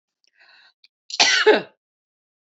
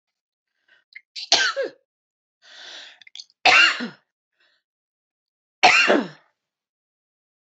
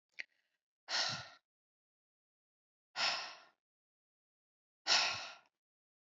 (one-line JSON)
{"cough_length": "2.6 s", "cough_amplitude": 29341, "cough_signal_mean_std_ratio": 0.31, "three_cough_length": "7.5 s", "three_cough_amplitude": 27291, "three_cough_signal_mean_std_ratio": 0.3, "exhalation_length": "6.1 s", "exhalation_amplitude": 4485, "exhalation_signal_mean_std_ratio": 0.31, "survey_phase": "alpha (2021-03-01 to 2021-08-12)", "age": "45-64", "gender": "Female", "wearing_mask": "No", "symptom_cough_any": true, "symptom_fatigue": true, "smoker_status": "Never smoked", "respiratory_condition_asthma": false, "respiratory_condition_other": true, "recruitment_source": "Test and Trace", "submission_delay": "1 day", "covid_test_result": "Positive", "covid_test_method": "RT-qPCR"}